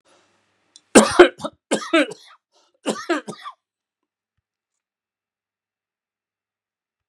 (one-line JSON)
{"three_cough_length": "7.1 s", "three_cough_amplitude": 32768, "three_cough_signal_mean_std_ratio": 0.22, "survey_phase": "beta (2021-08-13 to 2022-03-07)", "age": "65+", "gender": "Male", "wearing_mask": "No", "symptom_none": true, "smoker_status": "Never smoked", "respiratory_condition_asthma": false, "respiratory_condition_other": false, "recruitment_source": "REACT", "submission_delay": "1 day", "covid_test_result": "Negative", "covid_test_method": "RT-qPCR"}